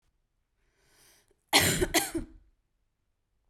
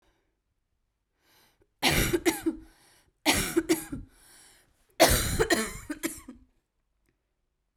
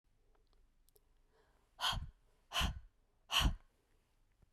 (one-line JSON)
{"cough_length": "3.5 s", "cough_amplitude": 14896, "cough_signal_mean_std_ratio": 0.31, "three_cough_length": "7.8 s", "three_cough_amplitude": 15412, "three_cough_signal_mean_std_ratio": 0.39, "exhalation_length": "4.5 s", "exhalation_amplitude": 3302, "exhalation_signal_mean_std_ratio": 0.33, "survey_phase": "beta (2021-08-13 to 2022-03-07)", "age": "18-44", "gender": "Female", "wearing_mask": "No", "symptom_cough_any": true, "symptom_new_continuous_cough": true, "symptom_runny_or_blocked_nose": true, "symptom_sore_throat": true, "symptom_fatigue": true, "symptom_onset": "5 days", "smoker_status": "Prefer not to say", "respiratory_condition_asthma": false, "respiratory_condition_other": false, "recruitment_source": "Test and Trace", "submission_delay": "2 days", "covid_test_result": "Positive", "covid_test_method": "RT-qPCR", "covid_ct_value": 25.0, "covid_ct_gene": "N gene"}